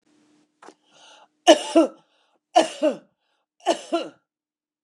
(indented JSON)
{
  "three_cough_length": "4.8 s",
  "three_cough_amplitude": 29203,
  "three_cough_signal_mean_std_ratio": 0.28,
  "survey_phase": "beta (2021-08-13 to 2022-03-07)",
  "age": "65+",
  "gender": "Female",
  "wearing_mask": "No",
  "symptom_none": true,
  "smoker_status": "Ex-smoker",
  "respiratory_condition_asthma": false,
  "respiratory_condition_other": false,
  "recruitment_source": "REACT",
  "submission_delay": "1 day",
  "covid_test_result": "Negative",
  "covid_test_method": "RT-qPCR",
  "influenza_a_test_result": "Unknown/Void",
  "influenza_b_test_result": "Unknown/Void"
}